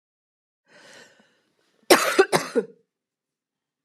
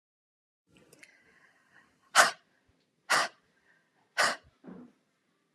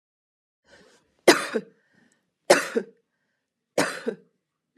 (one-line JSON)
{"cough_length": "3.8 s", "cough_amplitude": 32385, "cough_signal_mean_std_ratio": 0.26, "exhalation_length": "5.5 s", "exhalation_amplitude": 16906, "exhalation_signal_mean_std_ratio": 0.23, "three_cough_length": "4.8 s", "three_cough_amplitude": 29616, "three_cough_signal_mean_std_ratio": 0.25, "survey_phase": "beta (2021-08-13 to 2022-03-07)", "age": "45-64", "gender": "Female", "wearing_mask": "No", "symptom_none": true, "smoker_status": "Never smoked", "respiratory_condition_asthma": false, "respiratory_condition_other": false, "recruitment_source": "REACT", "submission_delay": "1 day", "covid_test_result": "Negative", "covid_test_method": "RT-qPCR"}